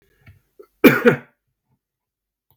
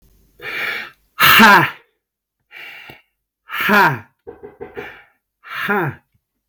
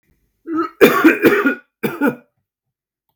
{"cough_length": "2.6 s", "cough_amplitude": 32768, "cough_signal_mean_std_ratio": 0.24, "exhalation_length": "6.5 s", "exhalation_amplitude": 32768, "exhalation_signal_mean_std_ratio": 0.39, "three_cough_length": "3.2 s", "three_cough_amplitude": 32768, "three_cough_signal_mean_std_ratio": 0.45, "survey_phase": "beta (2021-08-13 to 2022-03-07)", "age": "18-44", "gender": "Male", "wearing_mask": "No", "symptom_cough_any": true, "symptom_new_continuous_cough": true, "symptom_runny_or_blocked_nose": true, "symptom_onset": "12 days", "smoker_status": "Ex-smoker", "respiratory_condition_asthma": false, "respiratory_condition_other": false, "recruitment_source": "REACT", "submission_delay": "0 days", "covid_test_result": "Negative", "covid_test_method": "RT-qPCR"}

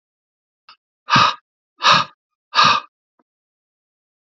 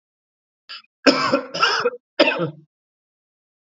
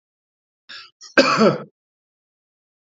{"exhalation_length": "4.3 s", "exhalation_amplitude": 31309, "exhalation_signal_mean_std_ratio": 0.32, "three_cough_length": "3.8 s", "three_cough_amplitude": 29775, "three_cough_signal_mean_std_ratio": 0.39, "cough_length": "3.0 s", "cough_amplitude": 27528, "cough_signal_mean_std_ratio": 0.29, "survey_phase": "alpha (2021-03-01 to 2021-08-12)", "age": "45-64", "gender": "Male", "wearing_mask": "No", "symptom_diarrhoea": true, "symptom_fever_high_temperature": true, "symptom_headache": true, "smoker_status": "Never smoked", "respiratory_condition_asthma": false, "respiratory_condition_other": false, "recruitment_source": "Test and Trace", "submission_delay": "2 days", "covid_test_result": "Positive", "covid_test_method": "RT-qPCR", "covid_ct_value": 28.0, "covid_ct_gene": "ORF1ab gene", "covid_ct_mean": 28.3, "covid_viral_load": "530 copies/ml", "covid_viral_load_category": "Minimal viral load (< 10K copies/ml)"}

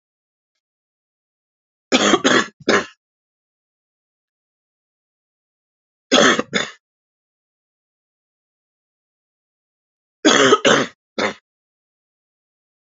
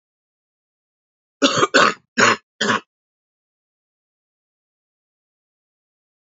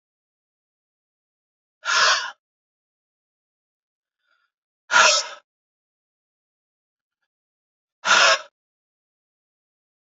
{"three_cough_length": "12.9 s", "three_cough_amplitude": 32767, "three_cough_signal_mean_std_ratio": 0.28, "cough_length": "6.3 s", "cough_amplitude": 32767, "cough_signal_mean_std_ratio": 0.26, "exhalation_length": "10.1 s", "exhalation_amplitude": 26558, "exhalation_signal_mean_std_ratio": 0.25, "survey_phase": "alpha (2021-03-01 to 2021-08-12)", "age": "45-64", "gender": "Female", "wearing_mask": "No", "symptom_new_continuous_cough": true, "symptom_fatigue": true, "symptom_change_to_sense_of_smell_or_taste": true, "symptom_loss_of_taste": true, "smoker_status": "Never smoked", "respiratory_condition_asthma": false, "respiratory_condition_other": false, "recruitment_source": "Test and Trace", "submission_delay": "2 days", "covid_test_result": "Positive", "covid_test_method": "RT-qPCR", "covid_ct_value": 12.5, "covid_ct_gene": "ORF1ab gene", "covid_ct_mean": 13.3, "covid_viral_load": "43000000 copies/ml", "covid_viral_load_category": "High viral load (>1M copies/ml)"}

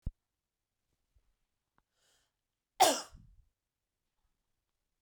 {"cough_length": "5.0 s", "cough_amplitude": 10581, "cough_signal_mean_std_ratio": 0.16, "survey_phase": "beta (2021-08-13 to 2022-03-07)", "age": "18-44", "gender": "Female", "wearing_mask": "No", "symptom_fatigue": true, "smoker_status": "Never smoked", "respiratory_condition_asthma": false, "respiratory_condition_other": false, "recruitment_source": "REACT", "submission_delay": "1 day", "covid_test_result": "Negative", "covid_test_method": "RT-qPCR"}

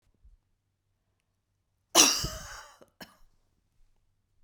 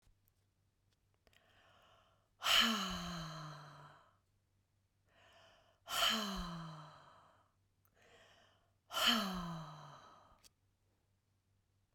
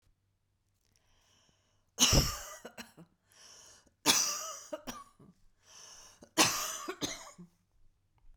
{"cough_length": "4.4 s", "cough_amplitude": 20883, "cough_signal_mean_std_ratio": 0.22, "exhalation_length": "11.9 s", "exhalation_amplitude": 3852, "exhalation_signal_mean_std_ratio": 0.36, "three_cough_length": "8.4 s", "three_cough_amplitude": 12405, "three_cough_signal_mean_std_ratio": 0.33, "survey_phase": "beta (2021-08-13 to 2022-03-07)", "age": "45-64", "gender": "Female", "wearing_mask": "No", "symptom_none": true, "symptom_onset": "6 days", "smoker_status": "Never smoked", "respiratory_condition_asthma": false, "respiratory_condition_other": false, "recruitment_source": "REACT", "submission_delay": "2 days", "covid_test_result": "Negative", "covid_test_method": "RT-qPCR", "influenza_a_test_result": "Unknown/Void", "influenza_b_test_result": "Unknown/Void"}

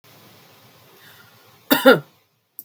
{"cough_length": "2.6 s", "cough_amplitude": 32767, "cough_signal_mean_std_ratio": 0.24, "survey_phase": "beta (2021-08-13 to 2022-03-07)", "age": "45-64", "gender": "Female", "wearing_mask": "No", "symptom_none": true, "smoker_status": "Never smoked", "respiratory_condition_asthma": false, "respiratory_condition_other": false, "recruitment_source": "REACT", "submission_delay": "3 days", "covid_test_result": "Negative", "covid_test_method": "RT-qPCR", "influenza_a_test_result": "Negative", "influenza_b_test_result": "Negative"}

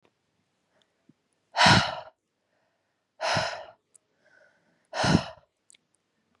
{"exhalation_length": "6.4 s", "exhalation_amplitude": 22056, "exhalation_signal_mean_std_ratio": 0.29, "survey_phase": "beta (2021-08-13 to 2022-03-07)", "age": "18-44", "gender": "Female", "wearing_mask": "No", "symptom_none": true, "smoker_status": "Never smoked", "respiratory_condition_asthma": false, "respiratory_condition_other": false, "recruitment_source": "REACT", "submission_delay": "2 days", "covid_test_result": "Negative", "covid_test_method": "RT-qPCR"}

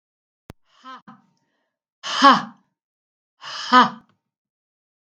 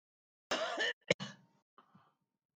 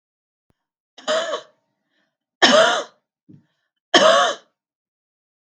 {"exhalation_length": "5.0 s", "exhalation_amplitude": 32507, "exhalation_signal_mean_std_ratio": 0.25, "cough_length": "2.6 s", "cough_amplitude": 6615, "cough_signal_mean_std_ratio": 0.34, "three_cough_length": "5.5 s", "three_cough_amplitude": 29844, "three_cough_signal_mean_std_ratio": 0.34, "survey_phase": "beta (2021-08-13 to 2022-03-07)", "age": "65+", "gender": "Female", "wearing_mask": "No", "symptom_cough_any": true, "symptom_fatigue": true, "smoker_status": "Never smoked", "respiratory_condition_asthma": true, "respiratory_condition_other": true, "recruitment_source": "REACT", "submission_delay": "1 day", "covid_test_result": "Negative", "covid_test_method": "RT-qPCR"}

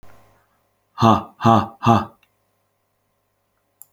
{"exhalation_length": "3.9 s", "exhalation_amplitude": 27883, "exhalation_signal_mean_std_ratio": 0.31, "survey_phase": "beta (2021-08-13 to 2022-03-07)", "age": "18-44", "gender": "Male", "wearing_mask": "No", "symptom_none": true, "smoker_status": "Ex-smoker", "respiratory_condition_asthma": false, "respiratory_condition_other": false, "recruitment_source": "REACT", "submission_delay": "5 days", "covid_test_result": "Negative", "covid_test_method": "RT-qPCR"}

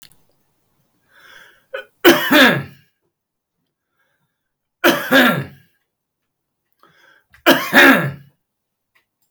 {"three_cough_length": "9.3 s", "three_cough_amplitude": 32768, "three_cough_signal_mean_std_ratio": 0.33, "survey_phase": "beta (2021-08-13 to 2022-03-07)", "age": "65+", "gender": "Male", "wearing_mask": "No", "symptom_none": true, "smoker_status": "Never smoked", "respiratory_condition_asthma": false, "respiratory_condition_other": false, "recruitment_source": "REACT", "submission_delay": "1 day", "covid_test_result": "Negative", "covid_test_method": "RT-qPCR"}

